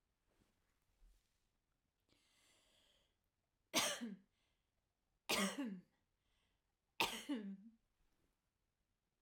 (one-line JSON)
{"three_cough_length": "9.2 s", "three_cough_amplitude": 2558, "three_cough_signal_mean_std_ratio": 0.3, "survey_phase": "alpha (2021-03-01 to 2021-08-12)", "age": "45-64", "gender": "Female", "wearing_mask": "No", "symptom_none": true, "smoker_status": "Never smoked", "respiratory_condition_asthma": true, "respiratory_condition_other": false, "recruitment_source": "REACT", "submission_delay": "2 days", "covid_test_result": "Negative", "covid_test_method": "RT-qPCR"}